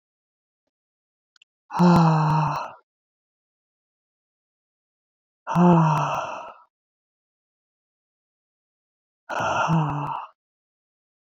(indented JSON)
{
  "exhalation_length": "11.3 s",
  "exhalation_amplitude": 16860,
  "exhalation_signal_mean_std_ratio": 0.38,
  "survey_phase": "beta (2021-08-13 to 2022-03-07)",
  "age": "18-44",
  "gender": "Female",
  "wearing_mask": "No",
  "symptom_none": true,
  "smoker_status": "Ex-smoker",
  "respiratory_condition_asthma": false,
  "respiratory_condition_other": false,
  "recruitment_source": "REACT",
  "submission_delay": "1 day",
  "covid_test_result": "Negative",
  "covid_test_method": "RT-qPCR",
  "influenza_a_test_result": "Negative",
  "influenza_b_test_result": "Negative"
}